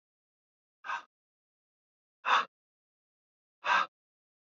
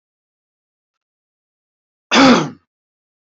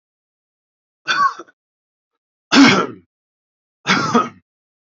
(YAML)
exhalation_length: 4.5 s
exhalation_amplitude: 6659
exhalation_signal_mean_std_ratio: 0.25
cough_length: 3.2 s
cough_amplitude: 29136
cough_signal_mean_std_ratio: 0.26
three_cough_length: 4.9 s
three_cough_amplitude: 30112
three_cough_signal_mean_std_ratio: 0.34
survey_phase: beta (2021-08-13 to 2022-03-07)
age: 18-44
gender: Male
wearing_mask: 'No'
symptom_fatigue: true
symptom_onset: 12 days
smoker_status: Ex-smoker
respiratory_condition_asthma: false
respiratory_condition_other: false
recruitment_source: REACT
submission_delay: 2 days
covid_test_result: Negative
covid_test_method: RT-qPCR
influenza_a_test_result: Negative
influenza_b_test_result: Negative